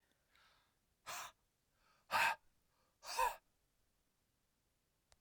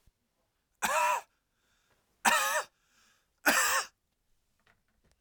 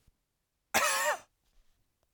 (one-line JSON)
{"exhalation_length": "5.2 s", "exhalation_amplitude": 2294, "exhalation_signal_mean_std_ratio": 0.27, "three_cough_length": "5.2 s", "three_cough_amplitude": 10345, "three_cough_signal_mean_std_ratio": 0.38, "cough_length": "2.1 s", "cough_amplitude": 8045, "cough_signal_mean_std_ratio": 0.37, "survey_phase": "beta (2021-08-13 to 2022-03-07)", "age": "18-44", "gender": "Male", "wearing_mask": "No", "symptom_cough_any": true, "symptom_headache": true, "smoker_status": "Never smoked", "respiratory_condition_asthma": false, "respiratory_condition_other": false, "recruitment_source": "Test and Trace", "submission_delay": "2 days", "covid_test_result": "Positive", "covid_test_method": "RT-qPCR", "covid_ct_value": 28.4, "covid_ct_gene": "N gene"}